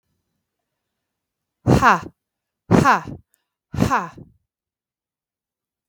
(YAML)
exhalation_length: 5.9 s
exhalation_amplitude: 32768
exhalation_signal_mean_std_ratio: 0.3
survey_phase: beta (2021-08-13 to 2022-03-07)
age: 45-64
gender: Female
wearing_mask: 'No'
symptom_none: true
smoker_status: Never smoked
respiratory_condition_asthma: false
respiratory_condition_other: false
recruitment_source: REACT
submission_delay: 2 days
covid_test_result: Negative
covid_test_method: RT-qPCR